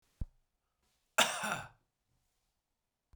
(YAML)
cough_length: 3.2 s
cough_amplitude: 9761
cough_signal_mean_std_ratio: 0.25
survey_phase: beta (2021-08-13 to 2022-03-07)
age: 45-64
gender: Male
wearing_mask: 'No'
symptom_runny_or_blocked_nose: true
symptom_fatigue: true
symptom_headache: true
symptom_onset: 12 days
smoker_status: Ex-smoker
respiratory_condition_asthma: false
respiratory_condition_other: false
recruitment_source: REACT
submission_delay: 2 days
covid_test_result: Negative
covid_test_method: RT-qPCR
influenza_a_test_result: Negative
influenza_b_test_result: Negative